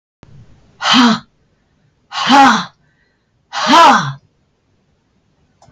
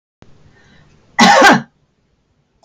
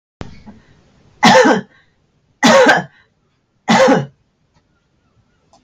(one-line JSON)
{"exhalation_length": "5.7 s", "exhalation_amplitude": 32768, "exhalation_signal_mean_std_ratio": 0.41, "cough_length": "2.6 s", "cough_amplitude": 32768, "cough_signal_mean_std_ratio": 0.36, "three_cough_length": "5.6 s", "three_cough_amplitude": 32768, "three_cough_signal_mean_std_ratio": 0.4, "survey_phase": "beta (2021-08-13 to 2022-03-07)", "age": "65+", "gender": "Female", "wearing_mask": "No", "symptom_none": true, "smoker_status": "Never smoked", "respiratory_condition_asthma": false, "respiratory_condition_other": false, "recruitment_source": "REACT", "submission_delay": "0 days", "covid_test_result": "Negative", "covid_test_method": "RT-qPCR", "influenza_a_test_result": "Negative", "influenza_b_test_result": "Negative"}